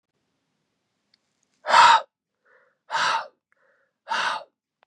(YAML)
exhalation_length: 4.9 s
exhalation_amplitude: 22522
exhalation_signal_mean_std_ratio: 0.31
survey_phase: beta (2021-08-13 to 2022-03-07)
age: 18-44
gender: Male
wearing_mask: 'Yes'
symptom_runny_or_blocked_nose: true
symptom_headache: true
smoker_status: Never smoked
respiratory_condition_asthma: false
respiratory_condition_other: false
recruitment_source: Test and Trace
submission_delay: 2 days
covid_test_result: Positive
covid_test_method: RT-qPCR
covid_ct_value: 23.2
covid_ct_gene: ORF1ab gene